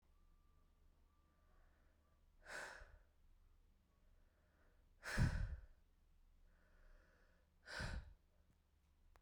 exhalation_length: 9.2 s
exhalation_amplitude: 1827
exhalation_signal_mean_std_ratio: 0.32
survey_phase: beta (2021-08-13 to 2022-03-07)
age: 18-44
gender: Female
wearing_mask: 'No'
symptom_cough_any: true
symptom_runny_or_blocked_nose: true
symptom_shortness_of_breath: true
symptom_sore_throat: true
symptom_headache: true
symptom_change_to_sense_of_smell_or_taste: true
symptom_loss_of_taste: true
symptom_onset: 4 days
smoker_status: Never smoked
respiratory_condition_asthma: false
respiratory_condition_other: false
recruitment_source: Test and Trace
submission_delay: 2 days
covid_test_result: Positive
covid_test_method: RT-qPCR
covid_ct_value: 12.9
covid_ct_gene: N gene
covid_ct_mean: 13.6
covid_viral_load: 34000000 copies/ml
covid_viral_load_category: High viral load (>1M copies/ml)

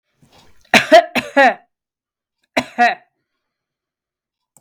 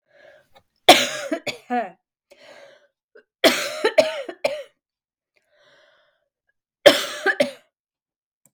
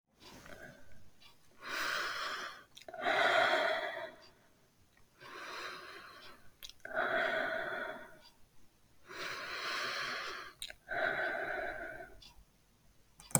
cough_length: 4.6 s
cough_amplitude: 32768
cough_signal_mean_std_ratio: 0.3
three_cough_length: 8.5 s
three_cough_amplitude: 32768
three_cough_signal_mean_std_ratio: 0.29
exhalation_length: 13.4 s
exhalation_amplitude: 11320
exhalation_signal_mean_std_ratio: 0.59
survey_phase: beta (2021-08-13 to 2022-03-07)
age: 45-64
gender: Female
wearing_mask: 'Yes'
symptom_cough_any: true
symptom_change_to_sense_of_smell_or_taste: true
symptom_loss_of_taste: true
symptom_onset: 3 days
smoker_status: Never smoked
respiratory_condition_asthma: false
respiratory_condition_other: false
recruitment_source: Test and Trace
submission_delay: 2 days
covid_test_result: Positive
covid_test_method: RT-qPCR
covid_ct_value: 20.6
covid_ct_gene: N gene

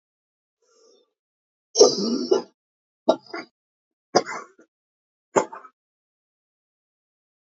cough_length: 7.4 s
cough_amplitude: 27041
cough_signal_mean_std_ratio: 0.24
survey_phase: beta (2021-08-13 to 2022-03-07)
age: 65+
gender: Female
wearing_mask: 'No'
symptom_cough_any: true
symptom_fatigue: true
smoker_status: Ex-smoker
respiratory_condition_asthma: true
respiratory_condition_other: true
recruitment_source: REACT
submission_delay: 1 day
covid_test_result: Negative
covid_test_method: RT-qPCR
influenza_a_test_result: Negative
influenza_b_test_result: Negative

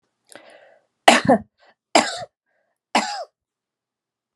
three_cough_length: 4.4 s
three_cough_amplitude: 32768
three_cough_signal_mean_std_ratio: 0.27
survey_phase: beta (2021-08-13 to 2022-03-07)
age: 65+
gender: Female
wearing_mask: 'No'
symptom_none: true
smoker_status: Never smoked
respiratory_condition_asthma: false
respiratory_condition_other: false
recruitment_source: Test and Trace
submission_delay: 2 days
covid_test_result: Positive
covid_test_method: RT-qPCR
covid_ct_value: 16.6
covid_ct_gene: N gene
covid_ct_mean: 17.1
covid_viral_load: 2400000 copies/ml
covid_viral_load_category: High viral load (>1M copies/ml)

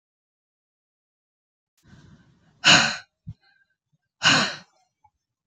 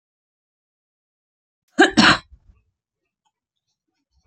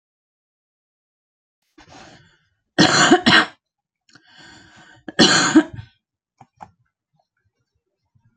exhalation_length: 5.5 s
exhalation_amplitude: 26797
exhalation_signal_mean_std_ratio: 0.25
cough_length: 4.3 s
cough_amplitude: 29182
cough_signal_mean_std_ratio: 0.21
three_cough_length: 8.4 s
three_cough_amplitude: 32312
three_cough_signal_mean_std_ratio: 0.29
survey_phase: beta (2021-08-13 to 2022-03-07)
age: 45-64
gender: Female
wearing_mask: 'No'
symptom_none: true
smoker_status: Current smoker (11 or more cigarettes per day)
respiratory_condition_asthma: false
respiratory_condition_other: false
recruitment_source: REACT
submission_delay: 5 days
covid_test_result: Negative
covid_test_method: RT-qPCR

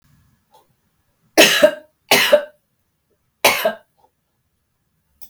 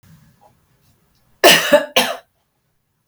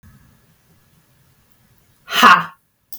three_cough_length: 5.3 s
three_cough_amplitude: 32768
three_cough_signal_mean_std_ratio: 0.31
cough_length: 3.1 s
cough_amplitude: 32768
cough_signal_mean_std_ratio: 0.31
exhalation_length: 3.0 s
exhalation_amplitude: 32768
exhalation_signal_mean_std_ratio: 0.26
survey_phase: beta (2021-08-13 to 2022-03-07)
age: 45-64
gender: Female
wearing_mask: 'No'
symptom_none: true
smoker_status: Never smoked
respiratory_condition_asthma: false
respiratory_condition_other: false
recruitment_source: REACT
submission_delay: 2 days
covid_test_result: Negative
covid_test_method: RT-qPCR
influenza_a_test_result: Negative
influenza_b_test_result: Negative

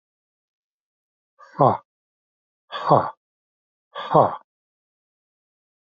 exhalation_length: 6.0 s
exhalation_amplitude: 27443
exhalation_signal_mean_std_ratio: 0.24
survey_phase: alpha (2021-03-01 to 2021-08-12)
age: 45-64
gender: Male
wearing_mask: 'No'
symptom_cough_any: true
symptom_new_continuous_cough: true
symptom_diarrhoea: true
symptom_fatigue: true
symptom_fever_high_temperature: true
symptom_headache: true
symptom_onset: 2 days
smoker_status: Ex-smoker
respiratory_condition_asthma: false
respiratory_condition_other: false
recruitment_source: Test and Trace
submission_delay: 2 days
covid_test_result: Positive
covid_test_method: RT-qPCR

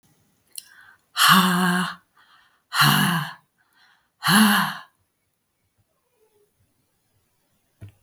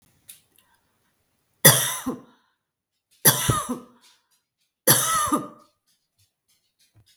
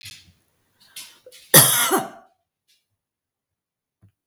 exhalation_length: 8.0 s
exhalation_amplitude: 24680
exhalation_signal_mean_std_ratio: 0.38
three_cough_length: 7.2 s
three_cough_amplitude: 32768
three_cough_signal_mean_std_ratio: 0.31
cough_length: 4.3 s
cough_amplitude: 32768
cough_signal_mean_std_ratio: 0.26
survey_phase: beta (2021-08-13 to 2022-03-07)
age: 65+
gender: Female
wearing_mask: 'No'
symptom_none: true
smoker_status: Ex-smoker
respiratory_condition_asthma: false
respiratory_condition_other: false
recruitment_source: REACT
submission_delay: 1 day
covid_test_result: Negative
covid_test_method: RT-qPCR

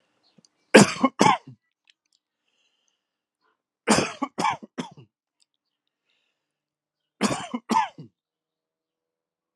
three_cough_length: 9.6 s
three_cough_amplitude: 32654
three_cough_signal_mean_std_ratio: 0.24
survey_phase: alpha (2021-03-01 to 2021-08-12)
age: 45-64
gender: Male
wearing_mask: 'No'
symptom_cough_any: true
symptom_fatigue: true
symptom_headache: true
symptom_onset: 7 days
smoker_status: Never smoked
respiratory_condition_asthma: false
respiratory_condition_other: false
recruitment_source: Test and Trace
submission_delay: 2 days
covid_test_result: Positive
covid_test_method: RT-qPCR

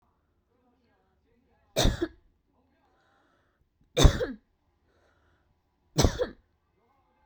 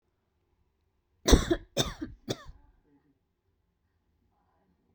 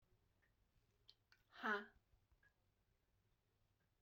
three_cough_length: 7.3 s
three_cough_amplitude: 20924
three_cough_signal_mean_std_ratio: 0.23
cough_length: 4.9 s
cough_amplitude: 19022
cough_signal_mean_std_ratio: 0.21
exhalation_length: 4.0 s
exhalation_amplitude: 948
exhalation_signal_mean_std_ratio: 0.22
survey_phase: beta (2021-08-13 to 2022-03-07)
age: 18-44
gender: Female
wearing_mask: 'No'
symptom_none: true
smoker_status: Never smoked
respiratory_condition_asthma: false
respiratory_condition_other: false
recruitment_source: REACT
submission_delay: 2 days
covid_test_result: Negative
covid_test_method: RT-qPCR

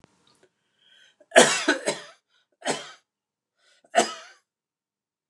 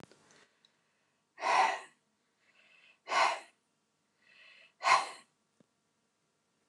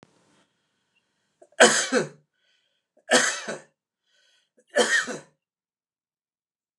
cough_length: 5.3 s
cough_amplitude: 29160
cough_signal_mean_std_ratio: 0.26
exhalation_length: 6.7 s
exhalation_amplitude: 8558
exhalation_signal_mean_std_ratio: 0.29
three_cough_length: 6.8 s
three_cough_amplitude: 29203
three_cough_signal_mean_std_ratio: 0.29
survey_phase: alpha (2021-03-01 to 2021-08-12)
age: 45-64
gender: Male
wearing_mask: 'No'
symptom_none: true
smoker_status: Never smoked
respiratory_condition_asthma: false
respiratory_condition_other: false
recruitment_source: REACT
submission_delay: 2 days
covid_test_result: Negative
covid_test_method: RT-qPCR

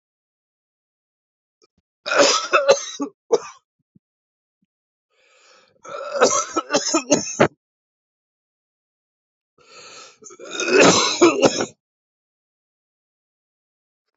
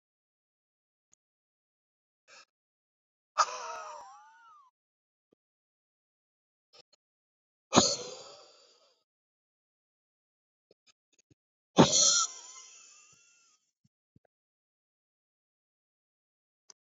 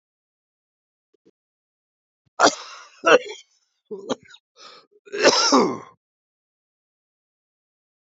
three_cough_length: 14.2 s
three_cough_amplitude: 28773
three_cough_signal_mean_std_ratio: 0.34
exhalation_length: 17.0 s
exhalation_amplitude: 23963
exhalation_signal_mean_std_ratio: 0.19
cough_length: 8.1 s
cough_amplitude: 27712
cough_signal_mean_std_ratio: 0.27
survey_phase: beta (2021-08-13 to 2022-03-07)
age: 45-64
gender: Male
wearing_mask: 'No'
symptom_cough_any: true
symptom_runny_or_blocked_nose: true
symptom_fatigue: true
symptom_headache: true
smoker_status: Ex-smoker
respiratory_condition_asthma: false
respiratory_condition_other: false
recruitment_source: Test and Trace
submission_delay: 2 days
covid_test_result: Positive
covid_test_method: ePCR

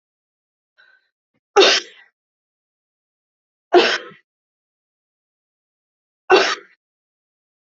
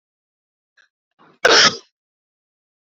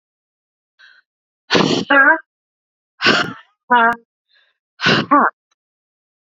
three_cough_length: 7.7 s
three_cough_amplitude: 28562
three_cough_signal_mean_std_ratio: 0.24
cough_length: 2.8 s
cough_amplitude: 32768
cough_signal_mean_std_ratio: 0.25
exhalation_length: 6.2 s
exhalation_amplitude: 32536
exhalation_signal_mean_std_ratio: 0.4
survey_phase: beta (2021-08-13 to 2022-03-07)
age: 18-44
gender: Female
wearing_mask: 'No'
symptom_none: true
symptom_onset: 12 days
smoker_status: Ex-smoker
respiratory_condition_asthma: true
respiratory_condition_other: false
recruitment_source: REACT
submission_delay: 2 days
covid_test_result: Negative
covid_test_method: RT-qPCR
influenza_a_test_result: Unknown/Void
influenza_b_test_result: Unknown/Void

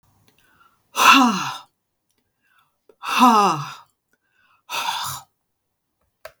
exhalation_length: 6.4 s
exhalation_amplitude: 32768
exhalation_signal_mean_std_ratio: 0.35
survey_phase: beta (2021-08-13 to 2022-03-07)
age: 45-64
gender: Female
wearing_mask: 'No'
symptom_none: true
smoker_status: Never smoked
respiratory_condition_asthma: false
respiratory_condition_other: false
recruitment_source: REACT
submission_delay: 1 day
covid_test_result: Negative
covid_test_method: RT-qPCR
influenza_a_test_result: Negative
influenza_b_test_result: Negative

